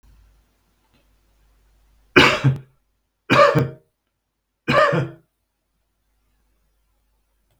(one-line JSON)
{"three_cough_length": "7.6 s", "three_cough_amplitude": 32768, "three_cough_signal_mean_std_ratio": 0.3, "survey_phase": "beta (2021-08-13 to 2022-03-07)", "age": "65+", "gender": "Male", "wearing_mask": "No", "symptom_none": true, "smoker_status": "Ex-smoker", "respiratory_condition_asthma": false, "respiratory_condition_other": false, "recruitment_source": "REACT", "submission_delay": "2 days", "covid_test_result": "Negative", "covid_test_method": "RT-qPCR", "influenza_a_test_result": "Unknown/Void", "influenza_b_test_result": "Unknown/Void"}